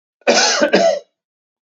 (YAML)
cough_length: 1.7 s
cough_amplitude: 32015
cough_signal_mean_std_ratio: 0.56
survey_phase: beta (2021-08-13 to 2022-03-07)
age: 18-44
gender: Male
wearing_mask: 'No'
symptom_none: true
smoker_status: Ex-smoker
respiratory_condition_asthma: true
respiratory_condition_other: false
recruitment_source: Test and Trace
submission_delay: 0 days
covid_test_result: Positive
covid_test_method: LFT